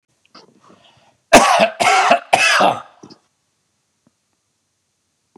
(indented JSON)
{
  "three_cough_length": "5.4 s",
  "three_cough_amplitude": 32768,
  "three_cough_signal_mean_std_ratio": 0.38,
  "survey_phase": "beta (2021-08-13 to 2022-03-07)",
  "age": "65+",
  "gender": "Male",
  "wearing_mask": "No",
  "symptom_none": true,
  "smoker_status": "Ex-smoker",
  "respiratory_condition_asthma": false,
  "respiratory_condition_other": false,
  "recruitment_source": "REACT",
  "submission_delay": "2 days",
  "covid_test_result": "Negative",
  "covid_test_method": "RT-qPCR"
}